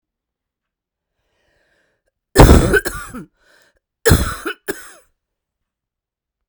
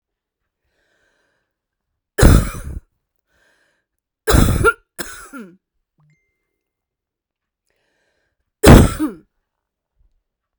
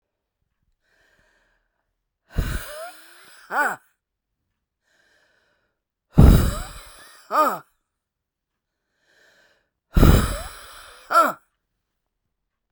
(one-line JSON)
{"cough_length": "6.5 s", "cough_amplitude": 32768, "cough_signal_mean_std_ratio": 0.27, "three_cough_length": "10.6 s", "three_cough_amplitude": 32768, "three_cough_signal_mean_std_ratio": 0.25, "exhalation_length": "12.7 s", "exhalation_amplitude": 32768, "exhalation_signal_mean_std_ratio": 0.27, "survey_phase": "beta (2021-08-13 to 2022-03-07)", "age": "45-64", "gender": "Female", "wearing_mask": "No", "symptom_cough_any": true, "symptom_runny_or_blocked_nose": true, "symptom_shortness_of_breath": true, "symptom_sore_throat": true, "symptom_abdominal_pain": true, "symptom_diarrhoea": true, "symptom_fatigue": true, "symptom_headache": true, "symptom_onset": "2 days", "smoker_status": "Ex-smoker", "respiratory_condition_asthma": false, "respiratory_condition_other": false, "recruitment_source": "Test and Trace", "submission_delay": "1 day", "covid_test_result": "Positive", "covid_test_method": "RT-qPCR"}